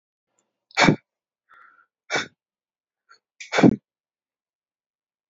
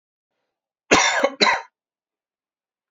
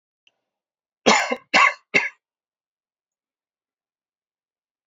exhalation_length: 5.3 s
exhalation_amplitude: 26638
exhalation_signal_mean_std_ratio: 0.22
cough_length: 2.9 s
cough_amplitude: 31673
cough_signal_mean_std_ratio: 0.34
three_cough_length: 4.9 s
three_cough_amplitude: 27096
three_cough_signal_mean_std_ratio: 0.26
survey_phase: alpha (2021-03-01 to 2021-08-12)
age: 18-44
gender: Male
wearing_mask: 'No'
symptom_fatigue: true
smoker_status: Never smoked
respiratory_condition_asthma: false
respiratory_condition_other: false
recruitment_source: REACT
submission_delay: 1 day
covid_test_result: Negative
covid_test_method: RT-qPCR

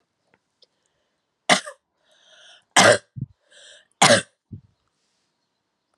three_cough_length: 6.0 s
three_cough_amplitude: 32767
three_cough_signal_mean_std_ratio: 0.24
survey_phase: alpha (2021-03-01 to 2021-08-12)
age: 45-64
gender: Female
wearing_mask: 'No'
symptom_fatigue: true
symptom_headache: true
symptom_onset: 3 days
smoker_status: Ex-smoker
respiratory_condition_asthma: false
respiratory_condition_other: false
recruitment_source: Test and Trace
submission_delay: 2 days
covid_test_result: Positive
covid_test_method: RT-qPCR
covid_ct_value: 28.6
covid_ct_gene: ORF1ab gene
covid_ct_mean: 28.7
covid_viral_load: 380 copies/ml
covid_viral_load_category: Minimal viral load (< 10K copies/ml)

